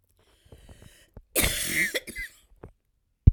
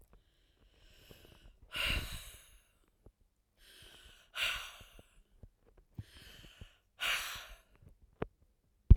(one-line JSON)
{"cough_length": "3.3 s", "cough_amplitude": 27551, "cough_signal_mean_std_ratio": 0.3, "exhalation_length": "9.0 s", "exhalation_amplitude": 15411, "exhalation_signal_mean_std_ratio": 0.21, "survey_phase": "alpha (2021-03-01 to 2021-08-12)", "age": "65+", "gender": "Female", "wearing_mask": "No", "symptom_fatigue": true, "smoker_status": "Ex-smoker", "respiratory_condition_asthma": true, "respiratory_condition_other": false, "recruitment_source": "REACT", "submission_delay": "1 day", "covid_test_result": "Negative", "covid_test_method": "RT-qPCR"}